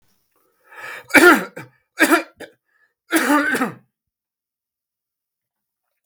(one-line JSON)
{"three_cough_length": "6.1 s", "three_cough_amplitude": 32768, "three_cough_signal_mean_std_ratio": 0.32, "survey_phase": "beta (2021-08-13 to 2022-03-07)", "age": "65+", "gender": "Male", "wearing_mask": "No", "symptom_none": true, "smoker_status": "Never smoked", "respiratory_condition_asthma": false, "respiratory_condition_other": false, "recruitment_source": "REACT", "submission_delay": "2 days", "covid_test_result": "Negative", "covid_test_method": "RT-qPCR", "influenza_a_test_result": "Unknown/Void", "influenza_b_test_result": "Unknown/Void"}